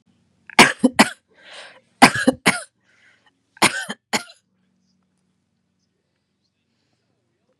three_cough_length: 7.6 s
three_cough_amplitude: 32768
three_cough_signal_mean_std_ratio: 0.23
survey_phase: beta (2021-08-13 to 2022-03-07)
age: 18-44
gender: Female
wearing_mask: 'No'
symptom_none: true
smoker_status: Never smoked
respiratory_condition_asthma: false
respiratory_condition_other: false
recruitment_source: REACT
submission_delay: 1 day
covid_test_result: Negative
covid_test_method: RT-qPCR
influenza_a_test_result: Negative
influenza_b_test_result: Negative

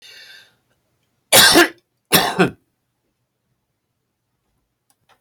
cough_length: 5.2 s
cough_amplitude: 32768
cough_signal_mean_std_ratio: 0.28
survey_phase: alpha (2021-03-01 to 2021-08-12)
age: 65+
gender: Male
wearing_mask: 'No'
symptom_cough_any: true
smoker_status: Ex-smoker
respiratory_condition_asthma: false
respiratory_condition_other: true
recruitment_source: REACT
submission_delay: 2 days
covid_test_result: Negative
covid_test_method: RT-qPCR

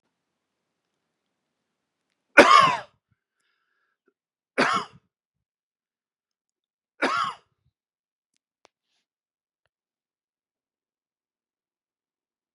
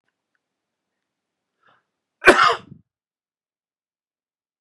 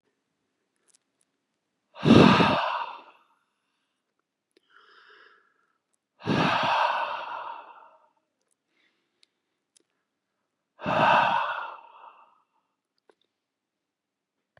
three_cough_length: 12.5 s
three_cough_amplitude: 32767
three_cough_signal_mean_std_ratio: 0.18
cough_length: 4.6 s
cough_amplitude: 32768
cough_signal_mean_std_ratio: 0.18
exhalation_length: 14.6 s
exhalation_amplitude: 23664
exhalation_signal_mean_std_ratio: 0.31
survey_phase: beta (2021-08-13 to 2022-03-07)
age: 18-44
gender: Male
wearing_mask: 'No'
symptom_none: true
smoker_status: Ex-smoker
respiratory_condition_asthma: false
respiratory_condition_other: false
recruitment_source: REACT
submission_delay: 4 days
covid_test_result: Negative
covid_test_method: RT-qPCR
influenza_a_test_result: Negative
influenza_b_test_result: Negative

